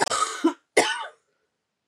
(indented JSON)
{
  "cough_length": "1.9 s",
  "cough_amplitude": 22136,
  "cough_signal_mean_std_ratio": 0.45,
  "survey_phase": "beta (2021-08-13 to 2022-03-07)",
  "age": "45-64",
  "gender": "Female",
  "wearing_mask": "No",
  "symptom_cough_any": true,
  "symptom_new_continuous_cough": true,
  "symptom_runny_or_blocked_nose": true,
  "symptom_shortness_of_breath": true,
  "symptom_fatigue": true,
  "symptom_fever_high_temperature": true,
  "symptom_headache": true,
  "symptom_change_to_sense_of_smell_or_taste": true,
  "symptom_loss_of_taste": true,
  "symptom_onset": "4 days",
  "smoker_status": "Never smoked",
  "respiratory_condition_asthma": false,
  "respiratory_condition_other": false,
  "recruitment_source": "Test and Trace",
  "submission_delay": "1 day",
  "covid_test_result": "Positive",
  "covid_test_method": "ePCR"
}